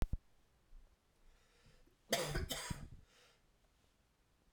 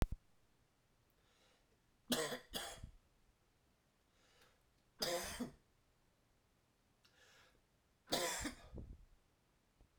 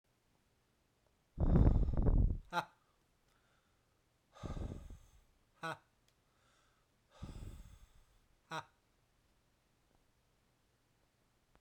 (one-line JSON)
{"cough_length": "4.5 s", "cough_amplitude": 3482, "cough_signal_mean_std_ratio": 0.33, "three_cough_length": "10.0 s", "three_cough_amplitude": 3174, "three_cough_signal_mean_std_ratio": 0.33, "exhalation_length": "11.6 s", "exhalation_amplitude": 5731, "exhalation_signal_mean_std_ratio": 0.3, "survey_phase": "beta (2021-08-13 to 2022-03-07)", "age": "45-64", "gender": "Male", "wearing_mask": "No", "symptom_cough_any": true, "symptom_new_continuous_cough": true, "symptom_sore_throat": true, "symptom_abdominal_pain": true, "symptom_fatigue": true, "symptom_fever_high_temperature": true, "symptom_headache": true, "symptom_change_to_sense_of_smell_or_taste": true, "symptom_other": true, "symptom_onset": "3 days", "smoker_status": "Never smoked", "respiratory_condition_asthma": false, "respiratory_condition_other": false, "recruitment_source": "Test and Trace", "submission_delay": "2 days", "covid_test_result": "Positive", "covid_test_method": "RT-qPCR", "covid_ct_value": 23.4, "covid_ct_gene": "ORF1ab gene"}